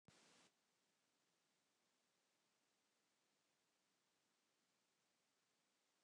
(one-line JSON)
{"three_cough_length": "6.0 s", "three_cough_amplitude": 65, "three_cough_signal_mean_std_ratio": 0.63, "survey_phase": "beta (2021-08-13 to 2022-03-07)", "age": "65+", "gender": "Male", "wearing_mask": "No", "symptom_none": true, "smoker_status": "Never smoked", "respiratory_condition_asthma": false, "respiratory_condition_other": false, "recruitment_source": "REACT", "submission_delay": "3 days", "covid_test_result": "Negative", "covid_test_method": "RT-qPCR"}